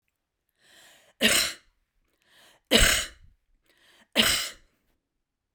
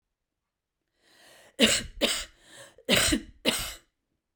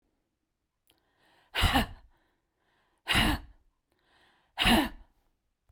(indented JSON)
{
  "three_cough_length": "5.5 s",
  "three_cough_amplitude": 18600,
  "three_cough_signal_mean_std_ratio": 0.32,
  "cough_length": "4.4 s",
  "cough_amplitude": 14976,
  "cough_signal_mean_std_ratio": 0.38,
  "exhalation_length": "5.7 s",
  "exhalation_amplitude": 9192,
  "exhalation_signal_mean_std_ratio": 0.33,
  "survey_phase": "beta (2021-08-13 to 2022-03-07)",
  "age": "45-64",
  "gender": "Female",
  "wearing_mask": "No",
  "symptom_none": true,
  "smoker_status": "Never smoked",
  "respiratory_condition_asthma": true,
  "respiratory_condition_other": true,
  "recruitment_source": "REACT",
  "submission_delay": "1 day",
  "covid_test_result": "Negative",
  "covid_test_method": "RT-qPCR"
}